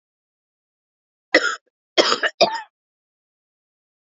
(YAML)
three_cough_length: 4.1 s
three_cough_amplitude: 30322
three_cough_signal_mean_std_ratio: 0.27
survey_phase: beta (2021-08-13 to 2022-03-07)
age: 18-44
gender: Female
wearing_mask: 'No'
symptom_cough_any: true
symptom_runny_or_blocked_nose: true
symptom_sore_throat: true
symptom_fatigue: true
symptom_fever_high_temperature: true
symptom_headache: true
symptom_other: true
smoker_status: Ex-smoker
respiratory_condition_asthma: true
respiratory_condition_other: false
recruitment_source: Test and Trace
submission_delay: 1 day
covid_test_result: Positive
covid_test_method: RT-qPCR